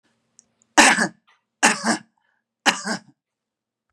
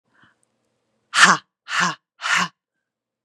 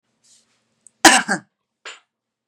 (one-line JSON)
{"three_cough_length": "3.9 s", "three_cough_amplitude": 32767, "three_cough_signal_mean_std_ratio": 0.32, "exhalation_length": "3.2 s", "exhalation_amplitude": 32767, "exhalation_signal_mean_std_ratio": 0.33, "cough_length": "2.5 s", "cough_amplitude": 32768, "cough_signal_mean_std_ratio": 0.23, "survey_phase": "beta (2021-08-13 to 2022-03-07)", "age": "45-64", "gender": "Female", "wearing_mask": "No", "symptom_none": true, "smoker_status": "Never smoked", "respiratory_condition_asthma": false, "respiratory_condition_other": false, "recruitment_source": "REACT", "submission_delay": "1 day", "covid_test_result": "Negative", "covid_test_method": "RT-qPCR", "influenza_a_test_result": "Negative", "influenza_b_test_result": "Negative"}